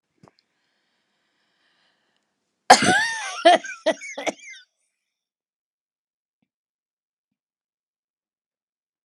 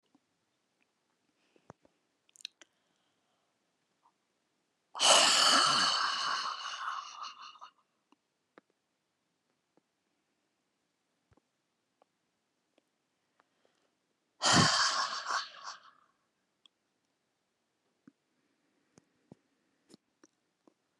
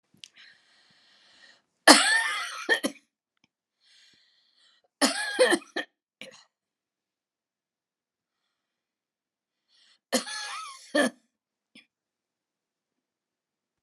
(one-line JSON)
{"cough_length": "9.0 s", "cough_amplitude": 32768, "cough_signal_mean_std_ratio": 0.22, "exhalation_length": "21.0 s", "exhalation_amplitude": 10820, "exhalation_signal_mean_std_ratio": 0.28, "three_cough_length": "13.8 s", "three_cough_amplitude": 32767, "three_cough_signal_mean_std_ratio": 0.25, "survey_phase": "alpha (2021-03-01 to 2021-08-12)", "age": "65+", "gender": "Female", "wearing_mask": "No", "symptom_none": true, "smoker_status": "Never smoked", "respiratory_condition_asthma": false, "respiratory_condition_other": false, "recruitment_source": "REACT", "submission_delay": "1 day", "covid_test_result": "Negative", "covid_test_method": "RT-qPCR"}